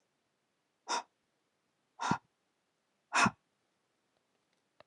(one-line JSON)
{"exhalation_length": "4.9 s", "exhalation_amplitude": 5569, "exhalation_signal_mean_std_ratio": 0.23, "survey_phase": "beta (2021-08-13 to 2022-03-07)", "age": "18-44", "gender": "Female", "wearing_mask": "No", "symptom_none": true, "smoker_status": "Never smoked", "respiratory_condition_asthma": false, "respiratory_condition_other": false, "recruitment_source": "REACT", "submission_delay": "1 day", "covid_test_result": "Negative", "covid_test_method": "RT-qPCR", "influenza_a_test_result": "Unknown/Void", "influenza_b_test_result": "Unknown/Void"}